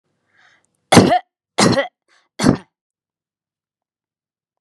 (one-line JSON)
{"three_cough_length": "4.6 s", "three_cough_amplitude": 32768, "three_cough_signal_mean_std_ratio": 0.29, "survey_phase": "beta (2021-08-13 to 2022-03-07)", "age": "18-44", "gender": "Female", "wearing_mask": "No", "symptom_none": true, "smoker_status": "Ex-smoker", "respiratory_condition_asthma": false, "respiratory_condition_other": false, "recruitment_source": "REACT", "submission_delay": "2 days", "covid_test_result": "Negative", "covid_test_method": "RT-qPCR", "influenza_a_test_result": "Negative", "influenza_b_test_result": "Negative"}